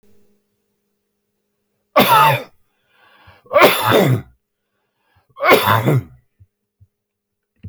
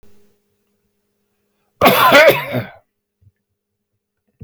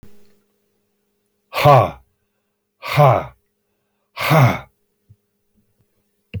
{"three_cough_length": "7.7 s", "three_cough_amplitude": 31854, "three_cough_signal_mean_std_ratio": 0.38, "cough_length": "4.4 s", "cough_amplitude": 32421, "cough_signal_mean_std_ratio": 0.33, "exhalation_length": "6.4 s", "exhalation_amplitude": 29021, "exhalation_signal_mean_std_ratio": 0.32, "survey_phase": "beta (2021-08-13 to 2022-03-07)", "age": "65+", "gender": "Male", "wearing_mask": "No", "symptom_none": true, "smoker_status": "Ex-smoker", "respiratory_condition_asthma": false, "respiratory_condition_other": false, "recruitment_source": "REACT", "submission_delay": "2 days", "covid_test_result": "Negative", "covid_test_method": "RT-qPCR"}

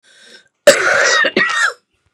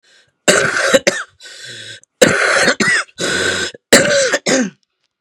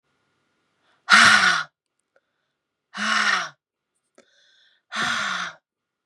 {"cough_length": "2.1 s", "cough_amplitude": 32768, "cough_signal_mean_std_ratio": 0.58, "three_cough_length": "5.2 s", "three_cough_amplitude": 32768, "three_cough_signal_mean_std_ratio": 0.61, "exhalation_length": "6.1 s", "exhalation_amplitude": 31365, "exhalation_signal_mean_std_ratio": 0.36, "survey_phase": "beta (2021-08-13 to 2022-03-07)", "age": "45-64", "gender": "Female", "wearing_mask": "No", "symptom_cough_any": true, "symptom_runny_or_blocked_nose": true, "symptom_sore_throat": true, "symptom_diarrhoea": true, "symptom_headache": true, "symptom_onset": "3 days", "smoker_status": "Ex-smoker", "respiratory_condition_asthma": true, "respiratory_condition_other": false, "recruitment_source": "Test and Trace", "submission_delay": "1 day", "covid_test_result": "Negative", "covid_test_method": "RT-qPCR"}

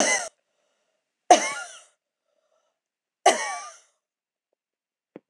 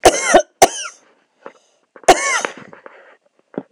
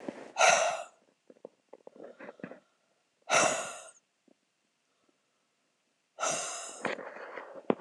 {"three_cough_length": "5.3 s", "three_cough_amplitude": 25968, "three_cough_signal_mean_std_ratio": 0.26, "cough_length": "3.7 s", "cough_amplitude": 26028, "cough_signal_mean_std_ratio": 0.35, "exhalation_length": "7.8 s", "exhalation_amplitude": 12869, "exhalation_signal_mean_std_ratio": 0.35, "survey_phase": "beta (2021-08-13 to 2022-03-07)", "age": "45-64", "gender": "Female", "wearing_mask": "No", "symptom_cough_any": true, "symptom_runny_or_blocked_nose": true, "symptom_onset": "3 days", "smoker_status": "Ex-smoker", "respiratory_condition_asthma": false, "respiratory_condition_other": false, "recruitment_source": "Test and Trace", "submission_delay": "2 days", "covid_test_result": "Positive", "covid_test_method": "ePCR"}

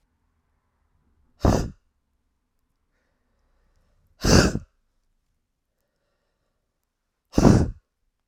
{"exhalation_length": "8.3 s", "exhalation_amplitude": 32768, "exhalation_signal_mean_std_ratio": 0.24, "survey_phase": "alpha (2021-03-01 to 2021-08-12)", "age": "45-64", "gender": "Female", "wearing_mask": "No", "symptom_none": true, "smoker_status": "Ex-smoker", "respiratory_condition_asthma": true, "respiratory_condition_other": false, "recruitment_source": "REACT", "submission_delay": "3 days", "covid_test_result": "Negative", "covid_test_method": "RT-qPCR"}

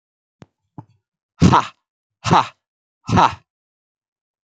{"exhalation_length": "4.4 s", "exhalation_amplitude": 28800, "exhalation_signal_mean_std_ratio": 0.29, "survey_phase": "alpha (2021-03-01 to 2021-08-12)", "age": "65+", "gender": "Male", "wearing_mask": "No", "symptom_none": true, "smoker_status": "Never smoked", "respiratory_condition_asthma": false, "respiratory_condition_other": true, "recruitment_source": "REACT", "submission_delay": "2 days", "covid_test_result": "Negative", "covid_test_method": "RT-qPCR"}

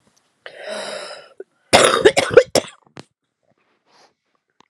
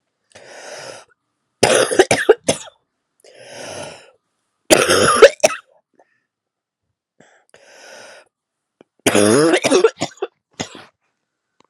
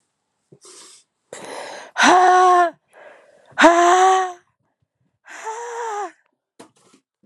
{"cough_length": "4.7 s", "cough_amplitude": 32768, "cough_signal_mean_std_ratio": 0.3, "three_cough_length": "11.7 s", "three_cough_amplitude": 32768, "three_cough_signal_mean_std_ratio": 0.34, "exhalation_length": "7.3 s", "exhalation_amplitude": 32767, "exhalation_signal_mean_std_ratio": 0.43, "survey_phase": "alpha (2021-03-01 to 2021-08-12)", "age": "18-44", "gender": "Female", "wearing_mask": "No", "symptom_cough_any": true, "symptom_new_continuous_cough": true, "symptom_shortness_of_breath": true, "symptom_fatigue": true, "symptom_fever_high_temperature": true, "symptom_headache": true, "symptom_change_to_sense_of_smell_or_taste": true, "symptom_onset": "3 days", "smoker_status": "Never smoked", "respiratory_condition_asthma": false, "respiratory_condition_other": false, "recruitment_source": "Test and Trace", "submission_delay": "2 days", "covid_test_result": "Positive", "covid_test_method": "RT-qPCR", "covid_ct_value": 28.0, "covid_ct_gene": "ORF1ab gene", "covid_ct_mean": 28.2, "covid_viral_load": "570 copies/ml", "covid_viral_load_category": "Minimal viral load (< 10K copies/ml)"}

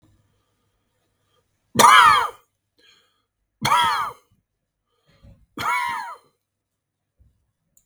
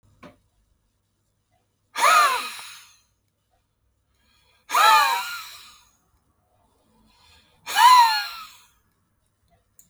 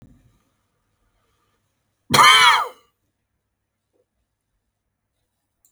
{"three_cough_length": "7.9 s", "three_cough_amplitude": 32768, "three_cough_signal_mean_std_ratio": 0.3, "exhalation_length": "9.9 s", "exhalation_amplitude": 25118, "exhalation_signal_mean_std_ratio": 0.33, "cough_length": "5.7 s", "cough_amplitude": 32768, "cough_signal_mean_std_ratio": 0.24, "survey_phase": "beta (2021-08-13 to 2022-03-07)", "age": "45-64", "gender": "Male", "wearing_mask": "No", "symptom_runny_or_blocked_nose": true, "smoker_status": "Never smoked", "respiratory_condition_asthma": false, "respiratory_condition_other": false, "recruitment_source": "REACT", "submission_delay": "2 days", "covid_test_result": "Negative", "covid_test_method": "RT-qPCR", "influenza_a_test_result": "Negative", "influenza_b_test_result": "Negative"}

